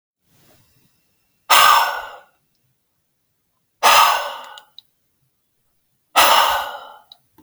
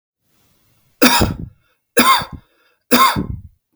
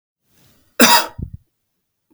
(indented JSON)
{
  "exhalation_length": "7.4 s",
  "exhalation_amplitude": 32768,
  "exhalation_signal_mean_std_ratio": 0.36,
  "three_cough_length": "3.8 s",
  "three_cough_amplitude": 32768,
  "three_cough_signal_mean_std_ratio": 0.41,
  "cough_length": "2.1 s",
  "cough_amplitude": 32768,
  "cough_signal_mean_std_ratio": 0.29,
  "survey_phase": "beta (2021-08-13 to 2022-03-07)",
  "age": "18-44",
  "gender": "Male",
  "wearing_mask": "No",
  "symptom_none": true,
  "symptom_onset": "11 days",
  "smoker_status": "Never smoked",
  "respiratory_condition_asthma": false,
  "respiratory_condition_other": false,
  "recruitment_source": "REACT",
  "submission_delay": "1 day",
  "covid_test_result": "Negative",
  "covid_test_method": "RT-qPCR"
}